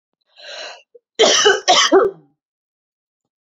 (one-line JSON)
{"cough_length": "3.4 s", "cough_amplitude": 29970, "cough_signal_mean_std_ratio": 0.42, "survey_phase": "alpha (2021-03-01 to 2021-08-12)", "age": "18-44", "gender": "Female", "wearing_mask": "No", "symptom_none": true, "smoker_status": "Never smoked", "respiratory_condition_asthma": false, "respiratory_condition_other": false, "recruitment_source": "REACT", "submission_delay": "2 days", "covid_test_result": "Negative", "covid_test_method": "RT-qPCR"}